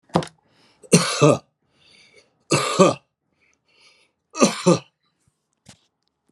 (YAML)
three_cough_length: 6.3 s
three_cough_amplitude: 32767
three_cough_signal_mean_std_ratio: 0.32
survey_phase: alpha (2021-03-01 to 2021-08-12)
age: 65+
gender: Male
wearing_mask: 'No'
symptom_none: true
smoker_status: Ex-smoker
respiratory_condition_asthma: false
respiratory_condition_other: false
recruitment_source: REACT
submission_delay: 2 days
covid_test_result: Negative
covid_test_method: RT-qPCR